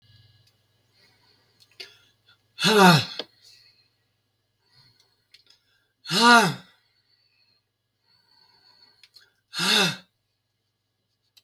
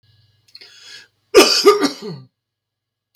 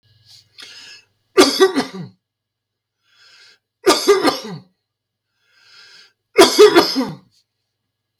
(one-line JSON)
{"exhalation_length": "11.4 s", "exhalation_amplitude": 23427, "exhalation_signal_mean_std_ratio": 0.26, "cough_length": "3.2 s", "cough_amplitude": 32768, "cough_signal_mean_std_ratio": 0.33, "three_cough_length": "8.2 s", "three_cough_amplitude": 32768, "three_cough_signal_mean_std_ratio": 0.33, "survey_phase": "beta (2021-08-13 to 2022-03-07)", "age": "65+", "gender": "Male", "wearing_mask": "No", "symptom_none": true, "smoker_status": "Never smoked", "respiratory_condition_asthma": false, "respiratory_condition_other": false, "recruitment_source": "REACT", "submission_delay": "36 days", "covid_test_result": "Negative", "covid_test_method": "RT-qPCR", "influenza_a_test_result": "Negative", "influenza_b_test_result": "Negative"}